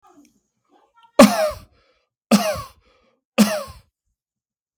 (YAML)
three_cough_length: 4.8 s
three_cough_amplitude: 32766
three_cough_signal_mean_std_ratio: 0.29
survey_phase: beta (2021-08-13 to 2022-03-07)
age: 18-44
gender: Male
wearing_mask: 'No'
symptom_none: true
smoker_status: Never smoked
respiratory_condition_asthma: false
respiratory_condition_other: false
recruitment_source: REACT
submission_delay: 1 day
covid_test_result: Negative
covid_test_method: RT-qPCR
influenza_a_test_result: Negative
influenza_b_test_result: Negative